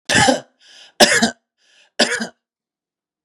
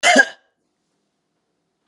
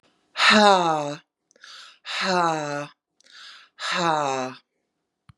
{"three_cough_length": "3.2 s", "three_cough_amplitude": 32768, "three_cough_signal_mean_std_ratio": 0.38, "cough_length": "1.9 s", "cough_amplitude": 30875, "cough_signal_mean_std_ratio": 0.27, "exhalation_length": "5.4 s", "exhalation_amplitude": 29186, "exhalation_signal_mean_std_ratio": 0.46, "survey_phase": "beta (2021-08-13 to 2022-03-07)", "age": "45-64", "gender": "Female", "wearing_mask": "No", "symptom_none": true, "smoker_status": "Ex-smoker", "respiratory_condition_asthma": false, "respiratory_condition_other": false, "recruitment_source": "REACT", "submission_delay": "2 days", "covid_test_result": "Negative", "covid_test_method": "RT-qPCR", "influenza_a_test_result": "Negative", "influenza_b_test_result": "Negative"}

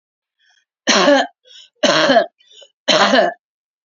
{"three_cough_length": "3.8 s", "three_cough_amplitude": 32740, "three_cough_signal_mean_std_ratio": 0.48, "survey_phase": "beta (2021-08-13 to 2022-03-07)", "age": "45-64", "gender": "Female", "wearing_mask": "No", "symptom_cough_any": true, "symptom_shortness_of_breath": true, "smoker_status": "Current smoker (11 or more cigarettes per day)", "respiratory_condition_asthma": false, "respiratory_condition_other": false, "recruitment_source": "REACT", "submission_delay": "2 days", "covid_test_result": "Negative", "covid_test_method": "RT-qPCR", "influenza_a_test_result": "Negative", "influenza_b_test_result": "Negative"}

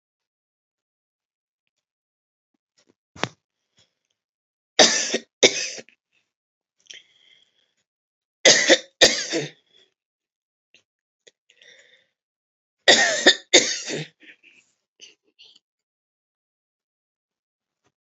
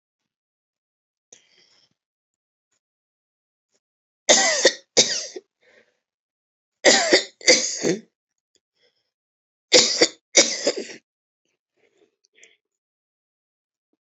{"three_cough_length": "18.1 s", "three_cough_amplitude": 32768, "three_cough_signal_mean_std_ratio": 0.23, "cough_length": "14.1 s", "cough_amplitude": 32615, "cough_signal_mean_std_ratio": 0.28, "survey_phase": "beta (2021-08-13 to 2022-03-07)", "age": "65+", "gender": "Female", "wearing_mask": "No", "symptom_none": true, "smoker_status": "Ex-smoker", "respiratory_condition_asthma": false, "respiratory_condition_other": false, "recruitment_source": "REACT", "submission_delay": "2 days", "covid_test_result": "Negative", "covid_test_method": "RT-qPCR"}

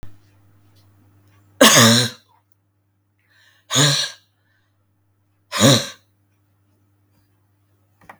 {"exhalation_length": "8.2 s", "exhalation_amplitude": 32768, "exhalation_signal_mean_std_ratio": 0.3, "survey_phase": "beta (2021-08-13 to 2022-03-07)", "age": "45-64", "gender": "Female", "wearing_mask": "No", "symptom_fatigue": true, "smoker_status": "Ex-smoker", "respiratory_condition_asthma": false, "respiratory_condition_other": false, "recruitment_source": "Test and Trace", "submission_delay": "2 days", "covid_test_result": "Positive", "covid_test_method": "RT-qPCR", "covid_ct_value": 33.0, "covid_ct_gene": "ORF1ab gene", "covid_ct_mean": 33.8, "covid_viral_load": "8.3 copies/ml", "covid_viral_load_category": "Minimal viral load (< 10K copies/ml)"}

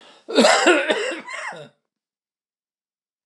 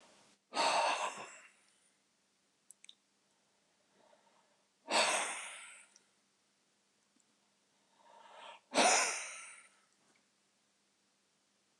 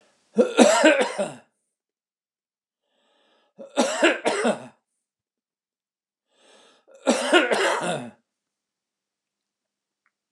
{"cough_length": "3.3 s", "cough_amplitude": 27414, "cough_signal_mean_std_ratio": 0.42, "exhalation_length": "11.8 s", "exhalation_amplitude": 4874, "exhalation_signal_mean_std_ratio": 0.32, "three_cough_length": "10.3 s", "three_cough_amplitude": 29203, "three_cough_signal_mean_std_ratio": 0.36, "survey_phase": "alpha (2021-03-01 to 2021-08-12)", "age": "65+", "gender": "Male", "wearing_mask": "No", "symptom_none": true, "smoker_status": "Ex-smoker", "respiratory_condition_asthma": false, "respiratory_condition_other": false, "recruitment_source": "REACT", "submission_delay": "1 day", "covid_test_result": "Negative", "covid_test_method": "RT-qPCR"}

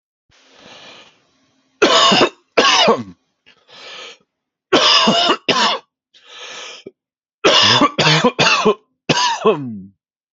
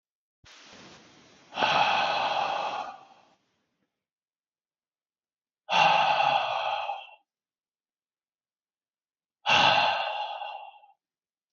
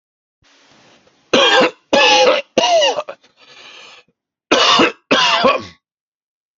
{"three_cough_length": "10.3 s", "three_cough_amplitude": 32768, "three_cough_signal_mean_std_ratio": 0.51, "exhalation_length": "11.5 s", "exhalation_amplitude": 12571, "exhalation_signal_mean_std_ratio": 0.45, "cough_length": "6.6 s", "cough_amplitude": 30272, "cough_signal_mean_std_ratio": 0.51, "survey_phase": "alpha (2021-03-01 to 2021-08-12)", "age": "18-44", "gender": "Male", "wearing_mask": "No", "symptom_none": true, "smoker_status": "Current smoker (1 to 10 cigarettes per day)", "respiratory_condition_asthma": false, "respiratory_condition_other": false, "recruitment_source": "REACT", "submission_delay": "17 days", "covid_test_result": "Positive", "covid_test_method": "RT-qPCR", "covid_ct_value": 32.0, "covid_ct_gene": "N gene"}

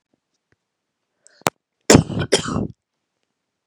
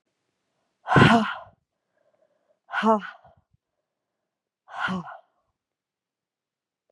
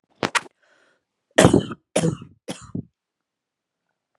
{"cough_length": "3.7 s", "cough_amplitude": 32768, "cough_signal_mean_std_ratio": 0.25, "exhalation_length": "6.9 s", "exhalation_amplitude": 28869, "exhalation_signal_mean_std_ratio": 0.27, "three_cough_length": "4.2 s", "three_cough_amplitude": 32767, "three_cough_signal_mean_std_ratio": 0.26, "survey_phase": "beta (2021-08-13 to 2022-03-07)", "age": "18-44", "gender": "Female", "wearing_mask": "No", "symptom_none": true, "smoker_status": "Never smoked", "respiratory_condition_asthma": false, "respiratory_condition_other": false, "recruitment_source": "REACT", "submission_delay": "2 days", "covid_test_result": "Negative", "covid_test_method": "RT-qPCR", "influenza_a_test_result": "Unknown/Void", "influenza_b_test_result": "Unknown/Void"}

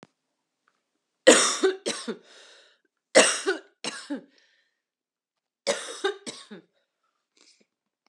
{"three_cough_length": "8.1 s", "three_cough_amplitude": 29299, "three_cough_signal_mean_std_ratio": 0.28, "survey_phase": "alpha (2021-03-01 to 2021-08-12)", "age": "18-44", "gender": "Female", "wearing_mask": "No", "symptom_cough_any": true, "symptom_fatigue": true, "symptom_headache": true, "symptom_change_to_sense_of_smell_or_taste": true, "symptom_onset": "2 days", "smoker_status": "Never smoked", "respiratory_condition_asthma": false, "respiratory_condition_other": false, "recruitment_source": "Test and Trace", "submission_delay": "2 days", "covid_test_result": "Positive", "covid_test_method": "RT-qPCR"}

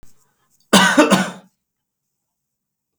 {"cough_length": "3.0 s", "cough_amplitude": 32768, "cough_signal_mean_std_ratio": 0.33, "survey_phase": "beta (2021-08-13 to 2022-03-07)", "age": "45-64", "gender": "Male", "wearing_mask": "No", "symptom_none": true, "smoker_status": "Ex-smoker", "respiratory_condition_asthma": false, "respiratory_condition_other": false, "recruitment_source": "REACT", "submission_delay": "-9 days", "covid_test_result": "Negative", "covid_test_method": "RT-qPCR", "influenza_a_test_result": "Unknown/Void", "influenza_b_test_result": "Unknown/Void"}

